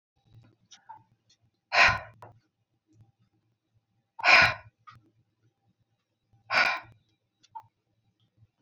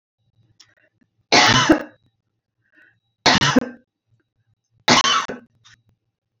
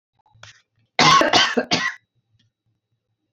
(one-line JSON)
{"exhalation_length": "8.6 s", "exhalation_amplitude": 14945, "exhalation_signal_mean_std_ratio": 0.24, "three_cough_length": "6.4 s", "three_cough_amplitude": 32767, "three_cough_signal_mean_std_ratio": 0.34, "cough_length": "3.3 s", "cough_amplitude": 28254, "cough_signal_mean_std_ratio": 0.39, "survey_phase": "alpha (2021-03-01 to 2021-08-12)", "age": "45-64", "gender": "Female", "wearing_mask": "No", "symptom_none": true, "symptom_onset": "8 days", "smoker_status": "Never smoked", "respiratory_condition_asthma": false, "respiratory_condition_other": false, "recruitment_source": "REACT", "submission_delay": "2 days", "covid_test_result": "Negative", "covid_test_method": "RT-qPCR"}